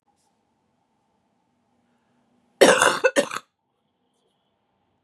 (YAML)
cough_length: 5.0 s
cough_amplitude: 32362
cough_signal_mean_std_ratio: 0.24
survey_phase: beta (2021-08-13 to 2022-03-07)
age: 45-64
gender: Female
wearing_mask: 'No'
symptom_cough_any: true
symptom_runny_or_blocked_nose: true
symptom_sore_throat: true
symptom_onset: 4 days
smoker_status: Prefer not to say
respiratory_condition_asthma: false
respiratory_condition_other: false
recruitment_source: Test and Trace
submission_delay: 2 days
covid_test_result: Negative
covid_test_method: RT-qPCR